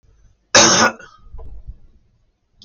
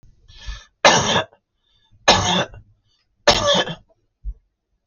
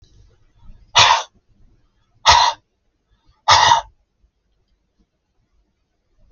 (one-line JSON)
{"cough_length": "2.6 s", "cough_amplitude": 32768, "cough_signal_mean_std_ratio": 0.35, "three_cough_length": "4.9 s", "three_cough_amplitude": 32768, "three_cough_signal_mean_std_ratio": 0.4, "exhalation_length": "6.3 s", "exhalation_amplitude": 32768, "exhalation_signal_mean_std_ratio": 0.3, "survey_phase": "beta (2021-08-13 to 2022-03-07)", "age": "65+", "gender": "Male", "wearing_mask": "No", "symptom_none": true, "smoker_status": "Ex-smoker", "respiratory_condition_asthma": false, "respiratory_condition_other": false, "recruitment_source": "REACT", "submission_delay": "2 days", "covid_test_result": "Negative", "covid_test_method": "RT-qPCR", "influenza_a_test_result": "Negative", "influenza_b_test_result": "Negative"}